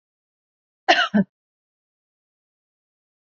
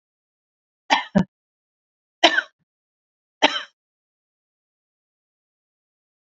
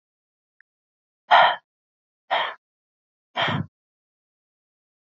{"cough_length": "3.3 s", "cough_amplitude": 28261, "cough_signal_mean_std_ratio": 0.22, "three_cough_length": "6.2 s", "three_cough_amplitude": 29669, "three_cough_signal_mean_std_ratio": 0.2, "exhalation_length": "5.1 s", "exhalation_amplitude": 29450, "exhalation_signal_mean_std_ratio": 0.26, "survey_phase": "beta (2021-08-13 to 2022-03-07)", "age": "45-64", "gender": "Female", "wearing_mask": "No", "symptom_sore_throat": true, "symptom_onset": "6 days", "smoker_status": "Never smoked", "respiratory_condition_asthma": false, "respiratory_condition_other": false, "recruitment_source": "REACT", "submission_delay": "1 day", "covid_test_result": "Positive", "covid_test_method": "RT-qPCR", "covid_ct_value": 25.0, "covid_ct_gene": "E gene", "influenza_a_test_result": "Negative", "influenza_b_test_result": "Negative"}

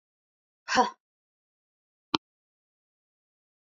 {"exhalation_length": "3.7 s", "exhalation_amplitude": 26841, "exhalation_signal_mean_std_ratio": 0.17, "survey_phase": "beta (2021-08-13 to 2022-03-07)", "age": "45-64", "gender": "Female", "wearing_mask": "No", "symptom_none": true, "smoker_status": "Never smoked", "respiratory_condition_asthma": false, "respiratory_condition_other": false, "recruitment_source": "REACT", "submission_delay": "1 day", "covid_test_result": "Negative", "covid_test_method": "RT-qPCR"}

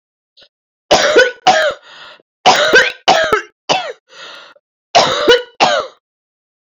{"cough_length": "6.7 s", "cough_amplitude": 31529, "cough_signal_mean_std_ratio": 0.51, "survey_phase": "beta (2021-08-13 to 2022-03-07)", "age": "45-64", "gender": "Female", "wearing_mask": "No", "symptom_cough_any": true, "symptom_abdominal_pain": true, "symptom_fatigue": true, "symptom_headache": true, "symptom_change_to_sense_of_smell_or_taste": true, "smoker_status": "Never smoked", "respiratory_condition_asthma": true, "respiratory_condition_other": false, "recruitment_source": "Test and Trace", "submission_delay": "2 days", "covid_test_result": "Positive", "covid_test_method": "RT-qPCR"}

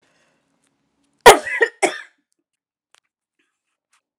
{"cough_length": "4.2 s", "cough_amplitude": 32768, "cough_signal_mean_std_ratio": 0.19, "survey_phase": "alpha (2021-03-01 to 2021-08-12)", "age": "45-64", "gender": "Female", "wearing_mask": "No", "symptom_shortness_of_breath": true, "symptom_diarrhoea": true, "symptom_fatigue": true, "symptom_loss_of_taste": true, "symptom_onset": "9 days", "smoker_status": "Never smoked", "respiratory_condition_asthma": false, "respiratory_condition_other": false, "recruitment_source": "REACT", "submission_delay": "2 days", "covid_test_result": "Negative", "covid_test_method": "RT-qPCR"}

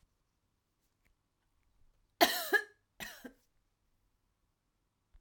{"cough_length": "5.2 s", "cough_amplitude": 9578, "cough_signal_mean_std_ratio": 0.2, "survey_phase": "alpha (2021-03-01 to 2021-08-12)", "age": "45-64", "gender": "Female", "wearing_mask": "No", "symptom_cough_any": true, "symptom_fatigue": true, "symptom_headache": true, "symptom_onset": "6 days", "smoker_status": "Ex-smoker", "respiratory_condition_asthma": true, "respiratory_condition_other": false, "recruitment_source": "REACT", "submission_delay": "1 day", "covid_test_result": "Negative", "covid_test_method": "RT-qPCR"}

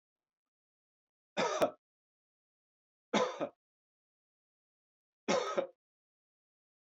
{"three_cough_length": "6.9 s", "three_cough_amplitude": 4862, "three_cough_signal_mean_std_ratio": 0.28, "survey_phase": "beta (2021-08-13 to 2022-03-07)", "age": "45-64", "gender": "Male", "wearing_mask": "No", "symptom_none": true, "smoker_status": "Ex-smoker", "respiratory_condition_asthma": false, "respiratory_condition_other": false, "recruitment_source": "Test and Trace", "submission_delay": "1 day", "covid_test_result": "Negative", "covid_test_method": "RT-qPCR"}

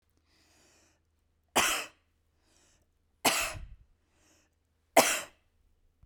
{"three_cough_length": "6.1 s", "three_cough_amplitude": 15547, "three_cough_signal_mean_std_ratio": 0.27, "survey_phase": "beta (2021-08-13 to 2022-03-07)", "age": "45-64", "gender": "Female", "wearing_mask": "No", "symptom_none": true, "smoker_status": "Never smoked", "respiratory_condition_asthma": false, "respiratory_condition_other": false, "recruitment_source": "REACT", "submission_delay": "1 day", "covid_test_result": "Negative", "covid_test_method": "RT-qPCR", "influenza_a_test_result": "Negative", "influenza_b_test_result": "Negative"}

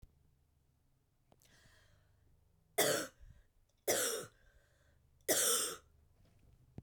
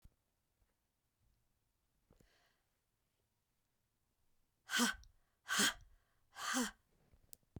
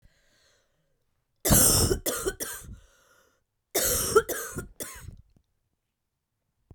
{"three_cough_length": "6.8 s", "three_cough_amplitude": 4146, "three_cough_signal_mean_std_ratio": 0.35, "exhalation_length": "7.6 s", "exhalation_amplitude": 3007, "exhalation_signal_mean_std_ratio": 0.26, "cough_length": "6.7 s", "cough_amplitude": 15356, "cough_signal_mean_std_ratio": 0.38, "survey_phase": "beta (2021-08-13 to 2022-03-07)", "age": "45-64", "gender": "Female", "wearing_mask": "No", "symptom_cough_any": true, "symptom_new_continuous_cough": true, "symptom_runny_or_blocked_nose": true, "symptom_shortness_of_breath": true, "symptom_sore_throat": true, "symptom_fatigue": true, "symptom_headache": true, "symptom_change_to_sense_of_smell_or_taste": true, "symptom_loss_of_taste": true, "symptom_other": true, "symptom_onset": "4 days", "smoker_status": "Never smoked", "respiratory_condition_asthma": false, "respiratory_condition_other": false, "recruitment_source": "Test and Trace", "submission_delay": "4 days", "covid_test_result": "Positive", "covid_test_method": "ePCR"}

